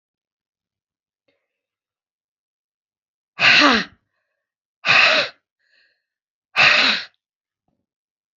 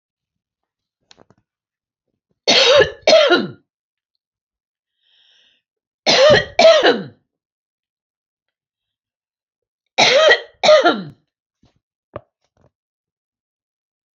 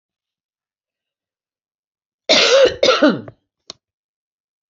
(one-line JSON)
{"exhalation_length": "8.4 s", "exhalation_amplitude": 32768, "exhalation_signal_mean_std_ratio": 0.31, "three_cough_length": "14.2 s", "three_cough_amplitude": 30927, "three_cough_signal_mean_std_ratio": 0.34, "cough_length": "4.7 s", "cough_amplitude": 29398, "cough_signal_mean_std_ratio": 0.33, "survey_phase": "beta (2021-08-13 to 2022-03-07)", "age": "65+", "gender": "Female", "wearing_mask": "No", "symptom_none": true, "smoker_status": "Never smoked", "respiratory_condition_asthma": false, "respiratory_condition_other": false, "recruitment_source": "REACT", "submission_delay": "2 days", "covid_test_result": "Negative", "covid_test_method": "RT-qPCR", "influenza_a_test_result": "Negative", "influenza_b_test_result": "Negative"}